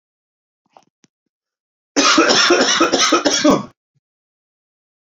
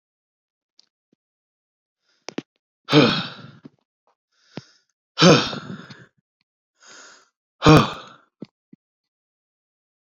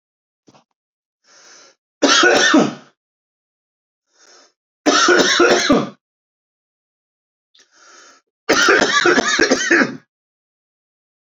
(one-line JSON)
{"cough_length": "5.1 s", "cough_amplitude": 31295, "cough_signal_mean_std_ratio": 0.46, "exhalation_length": "10.2 s", "exhalation_amplitude": 28511, "exhalation_signal_mean_std_ratio": 0.24, "three_cough_length": "11.3 s", "three_cough_amplitude": 29161, "three_cough_signal_mean_std_ratio": 0.43, "survey_phase": "beta (2021-08-13 to 2022-03-07)", "age": "18-44", "gender": "Male", "wearing_mask": "No", "symptom_runny_or_blocked_nose": true, "symptom_fatigue": true, "symptom_headache": true, "smoker_status": "Ex-smoker", "respiratory_condition_asthma": true, "respiratory_condition_other": false, "recruitment_source": "Test and Trace", "submission_delay": "2 days", "covid_test_result": "Positive", "covid_test_method": "RT-qPCR", "covid_ct_value": 21.6, "covid_ct_gene": "N gene"}